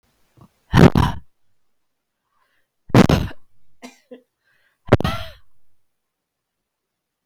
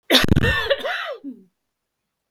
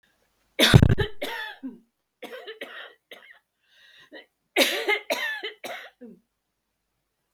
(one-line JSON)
{"exhalation_length": "7.3 s", "exhalation_amplitude": 32768, "exhalation_signal_mean_std_ratio": 0.26, "cough_length": "2.3 s", "cough_amplitude": 32768, "cough_signal_mean_std_ratio": 0.5, "three_cough_length": "7.3 s", "three_cough_amplitude": 32768, "three_cough_signal_mean_std_ratio": 0.32, "survey_phase": "beta (2021-08-13 to 2022-03-07)", "age": "45-64", "gender": "Female", "wearing_mask": "No", "symptom_cough_any": true, "smoker_status": "Never smoked", "respiratory_condition_asthma": true, "respiratory_condition_other": false, "recruitment_source": "REACT", "submission_delay": "2 days", "covid_test_result": "Negative", "covid_test_method": "RT-qPCR", "influenza_a_test_result": "Negative", "influenza_b_test_result": "Negative"}